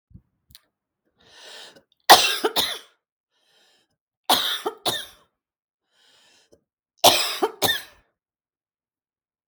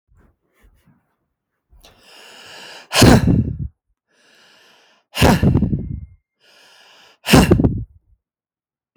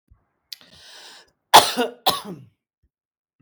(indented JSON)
{
  "three_cough_length": "9.5 s",
  "three_cough_amplitude": 32768,
  "three_cough_signal_mean_std_ratio": 0.27,
  "exhalation_length": "9.0 s",
  "exhalation_amplitude": 32768,
  "exhalation_signal_mean_std_ratio": 0.35,
  "cough_length": "3.4 s",
  "cough_amplitude": 32767,
  "cough_signal_mean_std_ratio": 0.24,
  "survey_phase": "beta (2021-08-13 to 2022-03-07)",
  "age": "45-64",
  "gender": "Female",
  "wearing_mask": "No",
  "symptom_none": true,
  "smoker_status": "Current smoker (1 to 10 cigarettes per day)",
  "respiratory_condition_asthma": false,
  "respiratory_condition_other": false,
  "recruitment_source": "REACT",
  "submission_delay": "0 days",
  "covid_test_result": "Negative",
  "covid_test_method": "RT-qPCR"
}